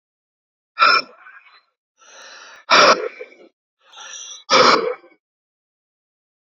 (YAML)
exhalation_length: 6.5 s
exhalation_amplitude: 32767
exhalation_signal_mean_std_ratio: 0.33
survey_phase: beta (2021-08-13 to 2022-03-07)
age: 45-64
gender: Male
wearing_mask: 'No'
symptom_cough_any: true
symptom_runny_or_blocked_nose: true
symptom_onset: 4 days
smoker_status: Ex-smoker
respiratory_condition_asthma: false
respiratory_condition_other: false
recruitment_source: Test and Trace
submission_delay: 2 days
covid_test_result: Positive
covid_test_method: ePCR